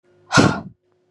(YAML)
exhalation_length: 1.1 s
exhalation_amplitude: 31201
exhalation_signal_mean_std_ratio: 0.38
survey_phase: beta (2021-08-13 to 2022-03-07)
age: 18-44
gender: Female
wearing_mask: 'No'
symptom_cough_any: true
symptom_new_continuous_cough: true
symptom_runny_or_blocked_nose: true
symptom_sore_throat: true
symptom_fatigue: true
symptom_headache: true
symptom_onset: 4 days
smoker_status: Never smoked
respiratory_condition_asthma: false
respiratory_condition_other: false
recruitment_source: Test and Trace
submission_delay: 1 day
covid_test_result: Positive
covid_test_method: RT-qPCR
covid_ct_value: 19.6
covid_ct_gene: N gene